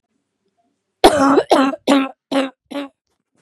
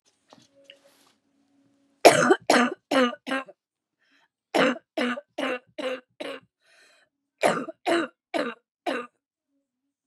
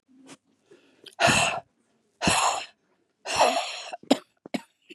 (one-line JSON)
{"cough_length": "3.4 s", "cough_amplitude": 32768, "cough_signal_mean_std_ratio": 0.44, "three_cough_length": "10.1 s", "three_cough_amplitude": 32738, "three_cough_signal_mean_std_ratio": 0.34, "exhalation_length": "4.9 s", "exhalation_amplitude": 21681, "exhalation_signal_mean_std_ratio": 0.42, "survey_phase": "beta (2021-08-13 to 2022-03-07)", "age": "45-64", "gender": "Female", "wearing_mask": "No", "symptom_cough_any": true, "symptom_shortness_of_breath": true, "symptom_sore_throat": true, "symptom_fatigue": true, "symptom_fever_high_temperature": true, "symptom_headache": true, "symptom_change_to_sense_of_smell_or_taste": true, "symptom_onset": "4 days", "smoker_status": "Never smoked", "respiratory_condition_asthma": true, "respiratory_condition_other": false, "recruitment_source": "Test and Trace", "submission_delay": "2 days", "covid_test_result": "Positive", "covid_test_method": "ePCR"}